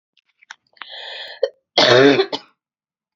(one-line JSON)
{"cough_length": "3.2 s", "cough_amplitude": 29421, "cough_signal_mean_std_ratio": 0.36, "survey_phase": "beta (2021-08-13 to 2022-03-07)", "age": "18-44", "gender": "Female", "wearing_mask": "No", "symptom_cough_any": true, "symptom_shortness_of_breath": true, "symptom_fatigue": true, "symptom_fever_high_temperature": true, "symptom_headache": true, "symptom_onset": "2 days", "smoker_status": "Never smoked", "respiratory_condition_asthma": false, "respiratory_condition_other": false, "recruitment_source": "Test and Trace", "submission_delay": "2 days", "covid_test_result": "Positive", "covid_test_method": "RT-qPCR"}